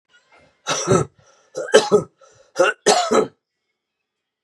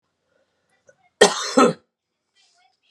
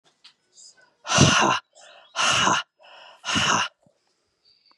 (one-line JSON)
{"three_cough_length": "4.4 s", "three_cough_amplitude": 32768, "three_cough_signal_mean_std_ratio": 0.4, "cough_length": "2.9 s", "cough_amplitude": 32767, "cough_signal_mean_std_ratio": 0.26, "exhalation_length": "4.8 s", "exhalation_amplitude": 24225, "exhalation_signal_mean_std_ratio": 0.45, "survey_phase": "beta (2021-08-13 to 2022-03-07)", "age": "18-44", "gender": "Male", "wearing_mask": "No", "symptom_cough_any": true, "symptom_new_continuous_cough": true, "symptom_runny_or_blocked_nose": true, "symptom_fatigue": true, "symptom_headache": true, "symptom_change_to_sense_of_smell_or_taste": true, "symptom_loss_of_taste": true, "symptom_onset": "3 days", "smoker_status": "Never smoked", "respiratory_condition_asthma": true, "respiratory_condition_other": false, "recruitment_source": "Test and Trace", "submission_delay": "1 day", "covid_test_result": "Positive", "covid_test_method": "ePCR"}